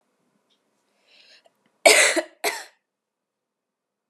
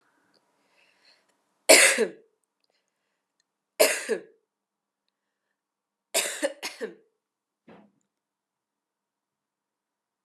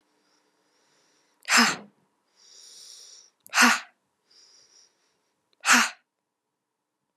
cough_length: 4.1 s
cough_amplitude: 32459
cough_signal_mean_std_ratio: 0.25
three_cough_length: 10.2 s
three_cough_amplitude: 29758
three_cough_signal_mean_std_ratio: 0.22
exhalation_length: 7.2 s
exhalation_amplitude: 22856
exhalation_signal_mean_std_ratio: 0.26
survey_phase: alpha (2021-03-01 to 2021-08-12)
age: 18-44
gender: Female
wearing_mask: 'No'
symptom_fatigue: true
symptom_headache: true
symptom_change_to_sense_of_smell_or_taste: true
symptom_onset: 11 days
smoker_status: Never smoked
respiratory_condition_asthma: false
respiratory_condition_other: false
recruitment_source: Test and Trace
submission_delay: 1 day
covid_test_result: Positive
covid_test_method: RT-qPCR
covid_ct_value: 18.5
covid_ct_gene: ORF1ab gene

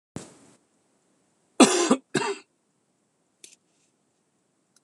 cough_length: 4.8 s
cough_amplitude: 25315
cough_signal_mean_std_ratio: 0.23
survey_phase: beta (2021-08-13 to 2022-03-07)
age: 45-64
gender: Male
wearing_mask: 'No'
symptom_cough_any: true
symptom_runny_or_blocked_nose: true
symptom_fever_high_temperature: true
symptom_onset: 4 days
smoker_status: Never smoked
respiratory_condition_asthma: false
respiratory_condition_other: false
recruitment_source: Test and Trace
submission_delay: 2 days
covid_test_result: Positive
covid_test_method: RT-qPCR
covid_ct_value: 15.8
covid_ct_gene: ORF1ab gene
covid_ct_mean: 16.2
covid_viral_load: 4800000 copies/ml
covid_viral_load_category: High viral load (>1M copies/ml)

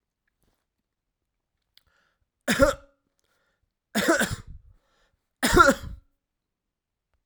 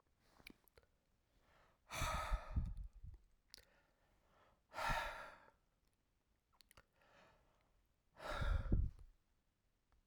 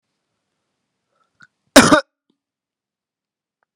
three_cough_length: 7.3 s
three_cough_amplitude: 20873
three_cough_signal_mean_std_ratio: 0.27
exhalation_length: 10.1 s
exhalation_amplitude: 2297
exhalation_signal_mean_std_ratio: 0.38
cough_length: 3.8 s
cough_amplitude: 32768
cough_signal_mean_std_ratio: 0.19
survey_phase: alpha (2021-03-01 to 2021-08-12)
age: 45-64
gender: Male
wearing_mask: 'Yes'
symptom_cough_any: true
symptom_loss_of_taste: true
symptom_onset: 3 days
smoker_status: Never smoked
respiratory_condition_asthma: false
respiratory_condition_other: false
recruitment_source: Test and Trace
submission_delay: 1 day
covid_test_result: Positive
covid_test_method: RT-qPCR
covid_ct_value: 16.3
covid_ct_gene: ORF1ab gene
covid_ct_mean: 16.7
covid_viral_load: 3400000 copies/ml
covid_viral_load_category: High viral load (>1M copies/ml)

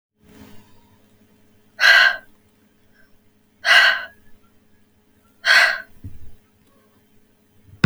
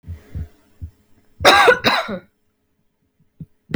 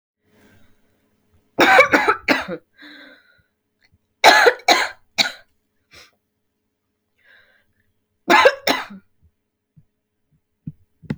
exhalation_length: 7.9 s
exhalation_amplitude: 29224
exhalation_signal_mean_std_ratio: 0.32
cough_length: 3.8 s
cough_amplitude: 32020
cough_signal_mean_std_ratio: 0.35
three_cough_length: 11.2 s
three_cough_amplitude: 32768
three_cough_signal_mean_std_ratio: 0.3
survey_phase: alpha (2021-03-01 to 2021-08-12)
age: 18-44
gender: Female
wearing_mask: 'No'
symptom_cough_any: true
symptom_abdominal_pain: true
symptom_fatigue: true
symptom_fever_high_temperature: true
symptom_headache: true
symptom_onset: 2 days
smoker_status: Never smoked
respiratory_condition_asthma: false
respiratory_condition_other: false
recruitment_source: Test and Trace
submission_delay: 1 day
covid_test_result: Positive
covid_test_method: RT-qPCR
covid_ct_value: 28.5
covid_ct_gene: ORF1ab gene
covid_ct_mean: 29.1
covid_viral_load: 290 copies/ml
covid_viral_load_category: Minimal viral load (< 10K copies/ml)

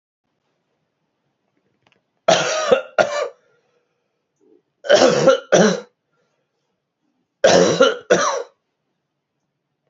three_cough_length: 9.9 s
three_cough_amplitude: 32664
three_cough_signal_mean_std_ratio: 0.37
survey_phase: beta (2021-08-13 to 2022-03-07)
age: 45-64
gender: Male
wearing_mask: 'No'
symptom_cough_any: true
symptom_runny_or_blocked_nose: true
symptom_shortness_of_breath: true
symptom_sore_throat: true
symptom_fatigue: true
symptom_onset: 5 days
smoker_status: Never smoked
respiratory_condition_asthma: false
respiratory_condition_other: false
recruitment_source: Test and Trace
submission_delay: 2 days
covid_test_result: Positive
covid_test_method: ePCR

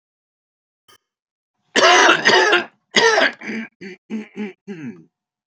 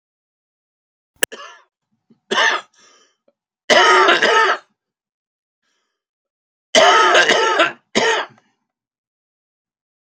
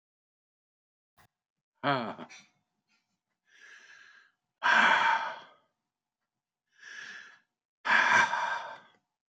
cough_length: 5.5 s
cough_amplitude: 30583
cough_signal_mean_std_ratio: 0.44
three_cough_length: 10.1 s
three_cough_amplitude: 32768
three_cough_signal_mean_std_ratio: 0.4
exhalation_length: 9.3 s
exhalation_amplitude: 8874
exhalation_signal_mean_std_ratio: 0.35
survey_phase: beta (2021-08-13 to 2022-03-07)
age: 65+
gender: Male
wearing_mask: 'No'
symptom_cough_any: true
symptom_runny_or_blocked_nose: true
symptom_onset: 4 days
smoker_status: Never smoked
respiratory_condition_asthma: false
respiratory_condition_other: false
recruitment_source: REACT
submission_delay: 2 days
covid_test_result: Negative
covid_test_method: RT-qPCR
influenza_a_test_result: Negative
influenza_b_test_result: Negative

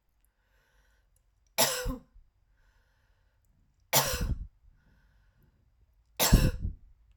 three_cough_length: 7.2 s
three_cough_amplitude: 17029
three_cough_signal_mean_std_ratio: 0.31
survey_phase: alpha (2021-03-01 to 2021-08-12)
age: 18-44
gender: Female
wearing_mask: 'No'
symptom_none: true
smoker_status: Ex-smoker
respiratory_condition_asthma: false
respiratory_condition_other: false
recruitment_source: REACT
submission_delay: 1 day
covid_test_result: Negative
covid_test_method: RT-qPCR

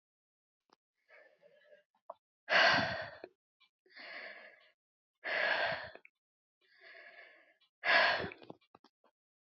exhalation_length: 9.6 s
exhalation_amplitude: 6401
exhalation_signal_mean_std_ratio: 0.33
survey_phase: alpha (2021-03-01 to 2021-08-12)
age: 65+
gender: Female
wearing_mask: 'No'
symptom_none: true
smoker_status: Never smoked
respiratory_condition_asthma: false
respiratory_condition_other: false
recruitment_source: REACT
submission_delay: 1 day
covid_test_result: Negative
covid_test_method: RT-qPCR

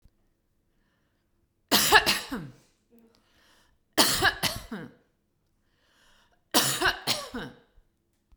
three_cough_length: 8.4 s
three_cough_amplitude: 25748
three_cough_signal_mean_std_ratio: 0.34
survey_phase: beta (2021-08-13 to 2022-03-07)
age: 45-64
gender: Female
wearing_mask: 'No'
symptom_none: true
smoker_status: Never smoked
respiratory_condition_asthma: false
respiratory_condition_other: false
recruitment_source: REACT
submission_delay: 1 day
covid_test_result: Negative
covid_test_method: RT-qPCR
influenza_a_test_result: Negative
influenza_b_test_result: Negative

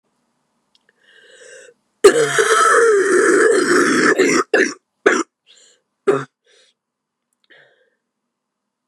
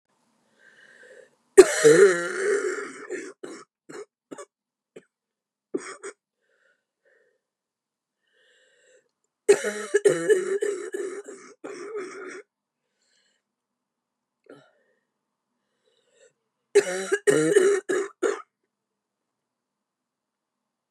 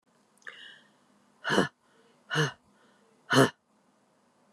cough_length: 8.9 s
cough_amplitude: 29204
cough_signal_mean_std_ratio: 0.49
three_cough_length: 20.9 s
three_cough_amplitude: 29204
three_cough_signal_mean_std_ratio: 0.3
exhalation_length: 4.5 s
exhalation_amplitude: 14700
exhalation_signal_mean_std_ratio: 0.28
survey_phase: beta (2021-08-13 to 2022-03-07)
age: 45-64
gender: Female
wearing_mask: 'No'
symptom_cough_any: true
symptom_runny_or_blocked_nose: true
symptom_shortness_of_breath: true
symptom_sore_throat: true
symptom_fatigue: true
symptom_fever_high_temperature: true
symptom_other: true
symptom_onset: 2 days
smoker_status: Never smoked
respiratory_condition_asthma: false
respiratory_condition_other: false
recruitment_source: Test and Trace
submission_delay: 2 days
covid_test_result: Positive
covid_test_method: ePCR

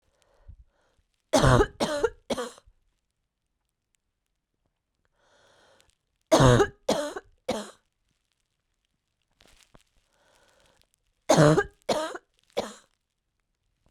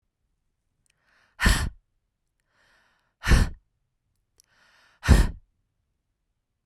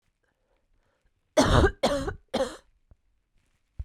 three_cough_length: 13.9 s
three_cough_amplitude: 21211
three_cough_signal_mean_std_ratio: 0.28
exhalation_length: 6.7 s
exhalation_amplitude: 26649
exhalation_signal_mean_std_ratio: 0.25
cough_length: 3.8 s
cough_amplitude: 17629
cough_signal_mean_std_ratio: 0.35
survey_phase: beta (2021-08-13 to 2022-03-07)
age: 18-44
gender: Female
wearing_mask: 'No'
symptom_cough_any: true
symptom_runny_or_blocked_nose: true
symptom_fatigue: true
symptom_fever_high_temperature: true
symptom_headache: true
symptom_onset: 2 days
smoker_status: Never smoked
respiratory_condition_asthma: false
respiratory_condition_other: false
recruitment_source: Test and Trace
submission_delay: 1 day
covid_test_result: Positive
covid_test_method: RT-qPCR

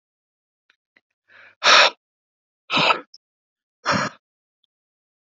exhalation_length: 5.4 s
exhalation_amplitude: 29052
exhalation_signal_mean_std_ratio: 0.28
survey_phase: beta (2021-08-13 to 2022-03-07)
age: 18-44
gender: Male
wearing_mask: 'No'
symptom_none: true
smoker_status: Never smoked
respiratory_condition_asthma: false
respiratory_condition_other: false
recruitment_source: REACT
submission_delay: 38 days
covid_test_result: Negative
covid_test_method: RT-qPCR
influenza_a_test_result: Negative
influenza_b_test_result: Negative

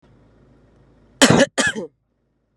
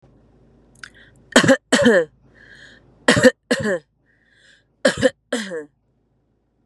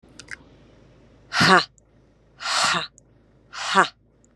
cough_length: 2.6 s
cough_amplitude: 32767
cough_signal_mean_std_ratio: 0.31
three_cough_length: 6.7 s
three_cough_amplitude: 32768
three_cough_signal_mean_std_ratio: 0.35
exhalation_length: 4.4 s
exhalation_amplitude: 31752
exhalation_signal_mean_std_ratio: 0.35
survey_phase: beta (2021-08-13 to 2022-03-07)
age: 18-44
gender: Female
wearing_mask: 'No'
symptom_none: true
smoker_status: Ex-smoker
respiratory_condition_asthma: true
respiratory_condition_other: false
recruitment_source: REACT
submission_delay: 4 days
covid_test_result: Negative
covid_test_method: RT-qPCR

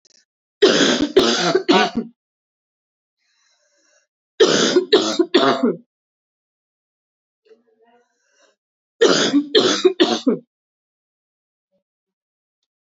three_cough_length: 13.0 s
three_cough_amplitude: 29297
three_cough_signal_mean_std_ratio: 0.41
survey_phase: beta (2021-08-13 to 2022-03-07)
age: 18-44
gender: Female
wearing_mask: 'No'
symptom_cough_any: true
symptom_runny_or_blocked_nose: true
symptom_sore_throat: true
symptom_fatigue: true
symptom_headache: true
symptom_other: true
symptom_onset: 7 days
smoker_status: Never smoked
respiratory_condition_asthma: false
respiratory_condition_other: false
recruitment_source: Test and Trace
submission_delay: 2 days
covid_test_result: Positive
covid_test_method: RT-qPCR
covid_ct_value: 19.8
covid_ct_gene: N gene
covid_ct_mean: 20.3
covid_viral_load: 220000 copies/ml
covid_viral_load_category: Low viral load (10K-1M copies/ml)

